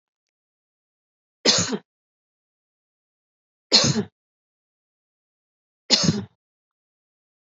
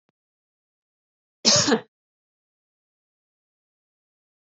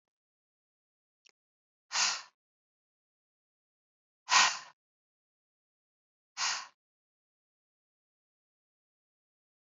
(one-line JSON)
{"three_cough_length": "7.4 s", "three_cough_amplitude": 28571, "three_cough_signal_mean_std_ratio": 0.26, "cough_length": "4.4 s", "cough_amplitude": 23493, "cough_signal_mean_std_ratio": 0.21, "exhalation_length": "9.7 s", "exhalation_amplitude": 11123, "exhalation_signal_mean_std_ratio": 0.2, "survey_phase": "beta (2021-08-13 to 2022-03-07)", "age": "45-64", "gender": "Female", "wearing_mask": "No", "symptom_none": true, "smoker_status": "Never smoked", "respiratory_condition_asthma": false, "respiratory_condition_other": false, "recruitment_source": "REACT", "submission_delay": "1 day", "covid_test_result": "Negative", "covid_test_method": "RT-qPCR"}